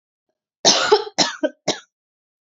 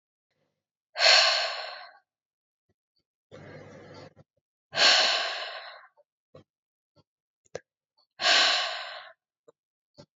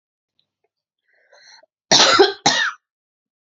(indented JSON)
{
  "three_cough_length": "2.6 s",
  "three_cough_amplitude": 32768,
  "three_cough_signal_mean_std_ratio": 0.37,
  "exhalation_length": "10.2 s",
  "exhalation_amplitude": 15829,
  "exhalation_signal_mean_std_ratio": 0.35,
  "cough_length": "3.4 s",
  "cough_amplitude": 32767,
  "cough_signal_mean_std_ratio": 0.34,
  "survey_phase": "beta (2021-08-13 to 2022-03-07)",
  "age": "18-44",
  "gender": "Female",
  "wearing_mask": "No",
  "symptom_none": true,
  "smoker_status": "Never smoked",
  "respiratory_condition_asthma": false,
  "respiratory_condition_other": false,
  "recruitment_source": "REACT",
  "submission_delay": "1 day",
  "covid_test_result": "Negative",
  "covid_test_method": "RT-qPCR",
  "influenza_a_test_result": "Negative",
  "influenza_b_test_result": "Negative"
}